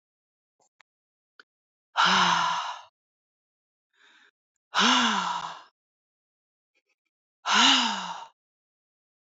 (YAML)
exhalation_length: 9.3 s
exhalation_amplitude: 17145
exhalation_signal_mean_std_ratio: 0.38
survey_phase: beta (2021-08-13 to 2022-03-07)
age: 45-64
gender: Female
wearing_mask: 'No'
symptom_none: true
smoker_status: Never smoked
respiratory_condition_asthma: false
respiratory_condition_other: false
recruitment_source: REACT
submission_delay: 1 day
covid_test_result: Negative
covid_test_method: RT-qPCR
influenza_a_test_result: Negative
influenza_b_test_result: Negative